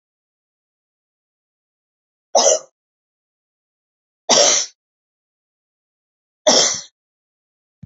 {
  "three_cough_length": "7.9 s",
  "three_cough_amplitude": 32768,
  "three_cough_signal_mean_std_ratio": 0.27,
  "survey_phase": "beta (2021-08-13 to 2022-03-07)",
  "age": "45-64",
  "gender": "Female",
  "wearing_mask": "No",
  "symptom_runny_or_blocked_nose": true,
  "symptom_sore_throat": true,
  "symptom_headache": true,
  "symptom_onset": "2 days",
  "smoker_status": "Never smoked",
  "respiratory_condition_asthma": false,
  "respiratory_condition_other": false,
  "recruitment_source": "REACT",
  "submission_delay": "1 day",
  "covid_test_result": "Negative",
  "covid_test_method": "RT-qPCR",
  "influenza_a_test_result": "Negative",
  "influenza_b_test_result": "Negative"
}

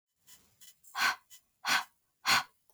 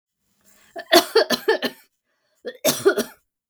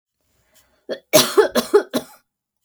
{
  "exhalation_length": "2.7 s",
  "exhalation_amplitude": 6475,
  "exhalation_signal_mean_std_ratio": 0.36,
  "cough_length": "3.5 s",
  "cough_amplitude": 32768,
  "cough_signal_mean_std_ratio": 0.37,
  "three_cough_length": "2.6 s",
  "three_cough_amplitude": 32766,
  "three_cough_signal_mean_std_ratio": 0.35,
  "survey_phase": "beta (2021-08-13 to 2022-03-07)",
  "age": "45-64",
  "gender": "Female",
  "wearing_mask": "No",
  "symptom_none": true,
  "smoker_status": "Never smoked",
  "respiratory_condition_asthma": false,
  "respiratory_condition_other": false,
  "recruitment_source": "REACT",
  "submission_delay": "1 day",
  "covid_test_result": "Negative",
  "covid_test_method": "RT-qPCR"
}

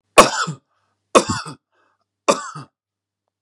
{
  "three_cough_length": "3.4 s",
  "three_cough_amplitude": 32768,
  "three_cough_signal_mean_std_ratio": 0.28,
  "survey_phase": "beta (2021-08-13 to 2022-03-07)",
  "age": "18-44",
  "gender": "Male",
  "wearing_mask": "No",
  "symptom_none": true,
  "smoker_status": "Never smoked",
  "respiratory_condition_asthma": false,
  "respiratory_condition_other": false,
  "recruitment_source": "REACT",
  "submission_delay": "0 days",
  "covid_test_result": "Negative",
  "covid_test_method": "RT-qPCR",
  "influenza_a_test_result": "Negative",
  "influenza_b_test_result": "Negative"
}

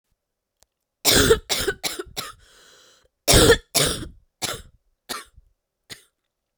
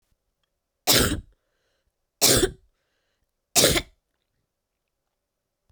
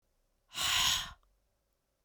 {
  "cough_length": "6.6 s",
  "cough_amplitude": 32767,
  "cough_signal_mean_std_ratio": 0.35,
  "three_cough_length": "5.7 s",
  "three_cough_amplitude": 28043,
  "three_cough_signal_mean_std_ratio": 0.3,
  "exhalation_length": "2.0 s",
  "exhalation_amplitude": 4763,
  "exhalation_signal_mean_std_ratio": 0.42,
  "survey_phase": "beta (2021-08-13 to 2022-03-07)",
  "age": "18-44",
  "gender": "Female",
  "wearing_mask": "No",
  "symptom_cough_any": true,
  "symptom_runny_or_blocked_nose": true,
  "symptom_sore_throat": true,
  "symptom_fatigue": true,
  "symptom_other": true,
  "smoker_status": "Ex-smoker",
  "respiratory_condition_asthma": false,
  "respiratory_condition_other": false,
  "recruitment_source": "Test and Trace",
  "submission_delay": "1 day",
  "covid_test_result": "Positive",
  "covid_test_method": "RT-qPCR"
}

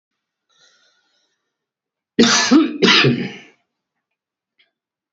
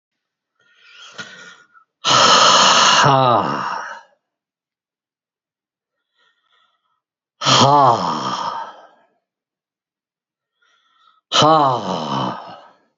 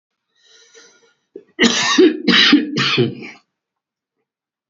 {
  "three_cough_length": "5.1 s",
  "three_cough_amplitude": 30502,
  "three_cough_signal_mean_std_ratio": 0.36,
  "exhalation_length": "13.0 s",
  "exhalation_amplitude": 32768,
  "exhalation_signal_mean_std_ratio": 0.43,
  "cough_length": "4.7 s",
  "cough_amplitude": 31320,
  "cough_signal_mean_std_ratio": 0.44,
  "survey_phase": "beta (2021-08-13 to 2022-03-07)",
  "age": "65+",
  "gender": "Male",
  "wearing_mask": "No",
  "symptom_cough_any": true,
  "symptom_new_continuous_cough": true,
  "smoker_status": "Ex-smoker",
  "respiratory_condition_asthma": false,
  "respiratory_condition_other": false,
  "recruitment_source": "REACT",
  "submission_delay": "1 day",
  "covid_test_result": "Negative",
  "covid_test_method": "RT-qPCR",
  "influenza_a_test_result": "Negative",
  "influenza_b_test_result": "Negative"
}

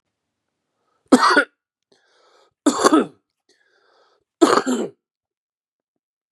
{
  "three_cough_length": "6.3 s",
  "three_cough_amplitude": 32675,
  "three_cough_signal_mean_std_ratio": 0.3,
  "survey_phase": "beta (2021-08-13 to 2022-03-07)",
  "age": "45-64",
  "gender": "Male",
  "wearing_mask": "No",
  "symptom_cough_any": true,
  "symptom_runny_or_blocked_nose": true,
  "symptom_fatigue": true,
  "symptom_headache": true,
  "symptom_change_to_sense_of_smell_or_taste": true,
  "symptom_onset": "4 days",
  "smoker_status": "Never smoked",
  "respiratory_condition_asthma": false,
  "respiratory_condition_other": false,
  "recruitment_source": "Test and Trace",
  "submission_delay": "2 days",
  "covid_test_result": "Positive",
  "covid_test_method": "ePCR"
}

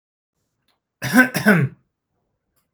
{
  "cough_length": "2.7 s",
  "cough_amplitude": 30923,
  "cough_signal_mean_std_ratio": 0.34,
  "survey_phase": "beta (2021-08-13 to 2022-03-07)",
  "age": "45-64",
  "gender": "Male",
  "wearing_mask": "No",
  "symptom_none": true,
  "smoker_status": "Never smoked",
  "respiratory_condition_asthma": true,
  "respiratory_condition_other": false,
  "recruitment_source": "REACT",
  "submission_delay": "3 days",
  "covid_test_result": "Negative",
  "covid_test_method": "RT-qPCR",
  "influenza_a_test_result": "Negative",
  "influenza_b_test_result": "Negative"
}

